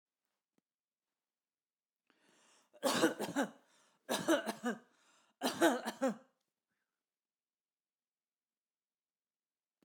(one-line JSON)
{"three_cough_length": "9.8 s", "three_cough_amplitude": 5445, "three_cough_signal_mean_std_ratio": 0.3, "survey_phase": "beta (2021-08-13 to 2022-03-07)", "age": "45-64", "gender": "Female", "wearing_mask": "No", "symptom_none": true, "smoker_status": "Never smoked", "respiratory_condition_asthma": false, "respiratory_condition_other": false, "recruitment_source": "REACT", "submission_delay": "2 days", "covid_test_result": "Negative", "covid_test_method": "RT-qPCR"}